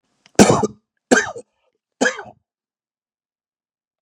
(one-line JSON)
{"three_cough_length": "4.0 s", "three_cough_amplitude": 32768, "three_cough_signal_mean_std_ratio": 0.27, "survey_phase": "beta (2021-08-13 to 2022-03-07)", "age": "45-64", "gender": "Male", "wearing_mask": "No", "symptom_cough_any": true, "symptom_runny_or_blocked_nose": true, "symptom_headache": true, "symptom_onset": "3 days", "smoker_status": "Ex-smoker", "respiratory_condition_asthma": false, "respiratory_condition_other": false, "recruitment_source": "Test and Trace", "submission_delay": "2 days", "covid_test_result": "Positive", "covid_test_method": "RT-qPCR", "covid_ct_value": 18.7, "covid_ct_gene": "ORF1ab gene", "covid_ct_mean": 19.3, "covid_viral_load": "480000 copies/ml", "covid_viral_load_category": "Low viral load (10K-1M copies/ml)"}